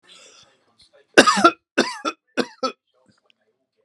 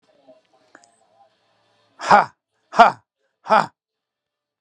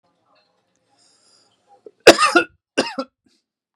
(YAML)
three_cough_length: 3.8 s
three_cough_amplitude: 32768
three_cough_signal_mean_std_ratio: 0.28
exhalation_length: 4.6 s
exhalation_amplitude: 32768
exhalation_signal_mean_std_ratio: 0.23
cough_length: 3.8 s
cough_amplitude: 32768
cough_signal_mean_std_ratio: 0.23
survey_phase: beta (2021-08-13 to 2022-03-07)
age: 18-44
gender: Male
wearing_mask: 'No'
symptom_none: true
smoker_status: Never smoked
respiratory_condition_asthma: false
respiratory_condition_other: false
recruitment_source: REACT
submission_delay: 2 days
covid_test_result: Negative
covid_test_method: RT-qPCR
influenza_a_test_result: Unknown/Void
influenza_b_test_result: Unknown/Void